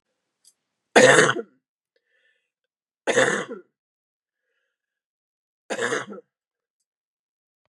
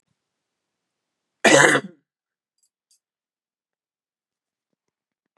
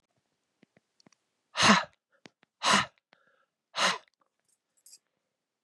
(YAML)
three_cough_length: 7.7 s
three_cough_amplitude: 29805
three_cough_signal_mean_std_ratio: 0.26
cough_length: 5.4 s
cough_amplitude: 31076
cough_signal_mean_std_ratio: 0.2
exhalation_length: 5.6 s
exhalation_amplitude: 15318
exhalation_signal_mean_std_ratio: 0.26
survey_phase: beta (2021-08-13 to 2022-03-07)
age: 45-64
gender: Female
wearing_mask: 'No'
symptom_cough_any: true
symptom_runny_or_blocked_nose: true
symptom_sore_throat: true
symptom_fatigue: true
symptom_other: true
symptom_onset: 10 days
smoker_status: Ex-smoker
respiratory_condition_asthma: false
respiratory_condition_other: false
recruitment_source: Test and Trace
submission_delay: 2 days
covid_test_result: Positive
covid_test_method: LAMP